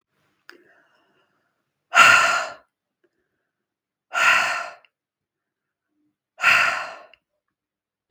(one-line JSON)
{"exhalation_length": "8.1 s", "exhalation_amplitude": 32766, "exhalation_signal_mean_std_ratio": 0.32, "survey_phase": "beta (2021-08-13 to 2022-03-07)", "age": "65+", "gender": "Female", "wearing_mask": "No", "symptom_none": true, "smoker_status": "Never smoked", "respiratory_condition_asthma": false, "respiratory_condition_other": false, "recruitment_source": "REACT", "submission_delay": "1 day", "covid_test_result": "Negative", "covid_test_method": "RT-qPCR"}